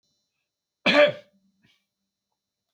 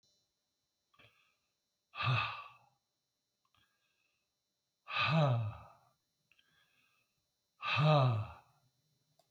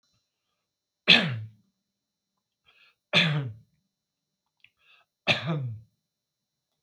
cough_length: 2.7 s
cough_amplitude: 19189
cough_signal_mean_std_ratio: 0.25
exhalation_length: 9.3 s
exhalation_amplitude: 4277
exhalation_signal_mean_std_ratio: 0.35
three_cough_length: 6.8 s
three_cough_amplitude: 25202
three_cough_signal_mean_std_ratio: 0.28
survey_phase: beta (2021-08-13 to 2022-03-07)
age: 65+
gender: Male
wearing_mask: 'No'
symptom_none: true
smoker_status: Never smoked
respiratory_condition_asthma: false
respiratory_condition_other: false
recruitment_source: REACT
submission_delay: 0 days
covid_test_result: Negative
covid_test_method: RT-qPCR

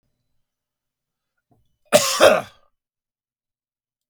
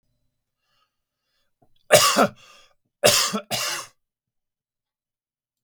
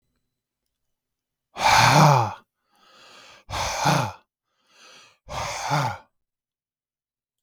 cough_length: 4.1 s
cough_amplitude: 32768
cough_signal_mean_std_ratio: 0.24
three_cough_length: 5.6 s
three_cough_amplitude: 32768
three_cough_signal_mean_std_ratio: 0.3
exhalation_length: 7.4 s
exhalation_amplitude: 24745
exhalation_signal_mean_std_ratio: 0.37
survey_phase: beta (2021-08-13 to 2022-03-07)
age: 45-64
gender: Male
wearing_mask: 'No'
symptom_none: true
smoker_status: Never smoked
respiratory_condition_asthma: false
respiratory_condition_other: false
recruitment_source: REACT
submission_delay: 1 day
covid_test_result: Negative
covid_test_method: RT-qPCR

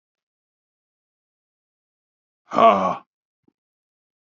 exhalation_length: 4.4 s
exhalation_amplitude: 26837
exhalation_signal_mean_std_ratio: 0.21
survey_phase: beta (2021-08-13 to 2022-03-07)
age: 45-64
gender: Male
wearing_mask: 'No'
symptom_cough_any: true
symptom_shortness_of_breath: true
symptom_sore_throat: true
symptom_fatigue: true
symptom_headache: true
smoker_status: Never smoked
respiratory_condition_asthma: true
respiratory_condition_other: false
recruitment_source: Test and Trace
submission_delay: 1 day
covid_test_result: Positive
covid_test_method: RT-qPCR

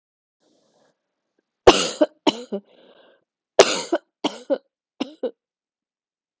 three_cough_length: 6.4 s
three_cough_amplitude: 32768
three_cough_signal_mean_std_ratio: 0.24
survey_phase: alpha (2021-03-01 to 2021-08-12)
age: 18-44
gender: Female
wearing_mask: 'No'
symptom_cough_any: true
symptom_fatigue: true
symptom_fever_high_temperature: true
symptom_headache: true
symptom_change_to_sense_of_smell_or_taste: true
symptom_loss_of_taste: true
symptom_onset: 4 days
smoker_status: Never smoked
respiratory_condition_asthma: false
respiratory_condition_other: false
recruitment_source: Test and Trace
submission_delay: 2 days
covid_test_result: Positive
covid_test_method: RT-qPCR
covid_ct_value: 13.2
covid_ct_gene: ORF1ab gene
covid_ct_mean: 13.3
covid_viral_load: 43000000 copies/ml
covid_viral_load_category: High viral load (>1M copies/ml)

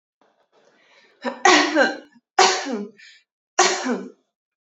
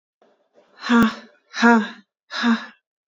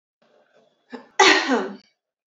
three_cough_length: 4.6 s
three_cough_amplitude: 28813
three_cough_signal_mean_std_ratio: 0.41
exhalation_length: 3.1 s
exhalation_amplitude: 26515
exhalation_signal_mean_std_ratio: 0.43
cough_length: 2.3 s
cough_amplitude: 32768
cough_signal_mean_std_ratio: 0.35
survey_phase: beta (2021-08-13 to 2022-03-07)
age: 18-44
gender: Female
wearing_mask: 'No'
symptom_none: true
smoker_status: Never smoked
respiratory_condition_asthma: false
respiratory_condition_other: false
recruitment_source: REACT
submission_delay: 1 day
covid_test_result: Negative
covid_test_method: RT-qPCR
influenza_a_test_result: Negative
influenza_b_test_result: Negative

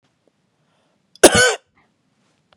cough_length: 2.6 s
cough_amplitude: 32768
cough_signal_mean_std_ratio: 0.24
survey_phase: beta (2021-08-13 to 2022-03-07)
age: 18-44
gender: Female
wearing_mask: 'No'
symptom_none: true
smoker_status: Never smoked
respiratory_condition_asthma: false
respiratory_condition_other: false
recruitment_source: REACT
submission_delay: 0 days
covid_test_result: Negative
covid_test_method: RT-qPCR
influenza_a_test_result: Negative
influenza_b_test_result: Negative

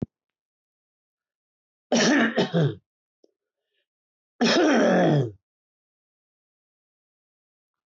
cough_length: 7.9 s
cough_amplitude: 12454
cough_signal_mean_std_ratio: 0.39
survey_phase: alpha (2021-03-01 to 2021-08-12)
age: 65+
gender: Male
wearing_mask: 'No'
symptom_none: true
smoker_status: Never smoked
respiratory_condition_asthma: false
respiratory_condition_other: false
recruitment_source: REACT
submission_delay: 2 days
covid_test_result: Negative
covid_test_method: RT-qPCR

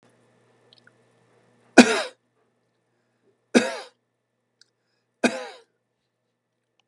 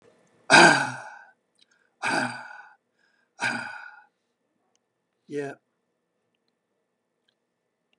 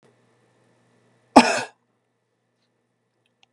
three_cough_length: 6.9 s
three_cough_amplitude: 32768
three_cough_signal_mean_std_ratio: 0.18
exhalation_length: 8.0 s
exhalation_amplitude: 30165
exhalation_signal_mean_std_ratio: 0.25
cough_length: 3.5 s
cough_amplitude: 32768
cough_signal_mean_std_ratio: 0.17
survey_phase: beta (2021-08-13 to 2022-03-07)
age: 65+
gender: Male
wearing_mask: 'No'
symptom_none: true
smoker_status: Never smoked
respiratory_condition_asthma: false
respiratory_condition_other: false
recruitment_source: REACT
submission_delay: 2 days
covid_test_result: Negative
covid_test_method: RT-qPCR
influenza_a_test_result: Negative
influenza_b_test_result: Negative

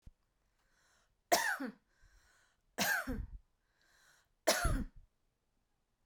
three_cough_length: 6.1 s
three_cough_amplitude: 6022
three_cough_signal_mean_std_ratio: 0.35
survey_phase: beta (2021-08-13 to 2022-03-07)
age: 45-64
gender: Female
wearing_mask: 'No'
symptom_none: true
smoker_status: Ex-smoker
respiratory_condition_asthma: false
respiratory_condition_other: false
recruitment_source: REACT
submission_delay: 2 days
covid_test_result: Negative
covid_test_method: RT-qPCR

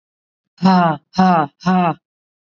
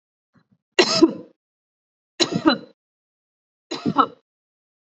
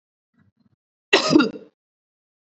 exhalation_length: 2.6 s
exhalation_amplitude: 26153
exhalation_signal_mean_std_ratio: 0.53
three_cough_length: 4.9 s
three_cough_amplitude: 32767
three_cough_signal_mean_std_ratio: 0.29
cough_length: 2.6 s
cough_amplitude: 29423
cough_signal_mean_std_ratio: 0.28
survey_phase: alpha (2021-03-01 to 2021-08-12)
age: 18-44
gender: Female
wearing_mask: 'No'
symptom_none: true
smoker_status: Ex-smoker
respiratory_condition_asthma: false
respiratory_condition_other: false
recruitment_source: REACT
submission_delay: 5 days
covid_test_result: Negative
covid_test_method: RT-qPCR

